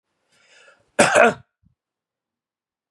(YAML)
cough_length: 2.9 s
cough_amplitude: 32213
cough_signal_mean_std_ratio: 0.26
survey_phase: beta (2021-08-13 to 2022-03-07)
age: 18-44
gender: Male
wearing_mask: 'No'
symptom_fatigue: true
smoker_status: Never smoked
respiratory_condition_asthma: false
respiratory_condition_other: false
recruitment_source: REACT
submission_delay: 3 days
covid_test_result: Negative
covid_test_method: RT-qPCR
influenza_a_test_result: Negative
influenza_b_test_result: Negative